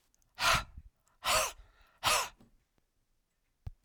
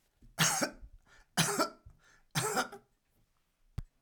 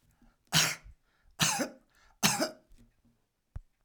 {"exhalation_length": "3.8 s", "exhalation_amplitude": 5997, "exhalation_signal_mean_std_ratio": 0.37, "three_cough_length": "4.0 s", "three_cough_amplitude": 6716, "three_cough_signal_mean_std_ratio": 0.41, "cough_length": "3.8 s", "cough_amplitude": 11940, "cough_signal_mean_std_ratio": 0.36, "survey_phase": "alpha (2021-03-01 to 2021-08-12)", "age": "65+", "gender": "Male", "wearing_mask": "No", "symptom_none": true, "smoker_status": "Ex-smoker", "respiratory_condition_asthma": false, "respiratory_condition_other": false, "recruitment_source": "REACT", "submission_delay": "2 days", "covid_test_result": "Negative", "covid_test_method": "RT-qPCR"}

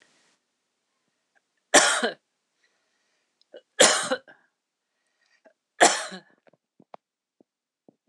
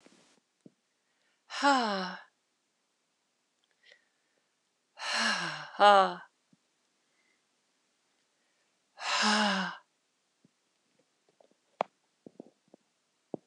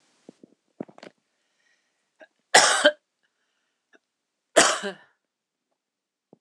{"three_cough_length": "8.1 s", "three_cough_amplitude": 25109, "three_cough_signal_mean_std_ratio": 0.24, "exhalation_length": "13.5 s", "exhalation_amplitude": 13790, "exhalation_signal_mean_std_ratio": 0.28, "cough_length": "6.4 s", "cough_amplitude": 26028, "cough_signal_mean_std_ratio": 0.23, "survey_phase": "alpha (2021-03-01 to 2021-08-12)", "age": "45-64", "gender": "Female", "wearing_mask": "No", "symptom_cough_any": true, "symptom_fatigue": true, "symptom_change_to_sense_of_smell_or_taste": true, "symptom_onset": "8 days", "smoker_status": "Ex-smoker", "respiratory_condition_asthma": false, "respiratory_condition_other": false, "recruitment_source": "Test and Trace", "submission_delay": "2 days", "covid_test_result": "Positive", "covid_test_method": "RT-qPCR", "covid_ct_value": 26.4, "covid_ct_gene": "N gene", "covid_ct_mean": 26.8, "covid_viral_load": "1600 copies/ml", "covid_viral_load_category": "Minimal viral load (< 10K copies/ml)"}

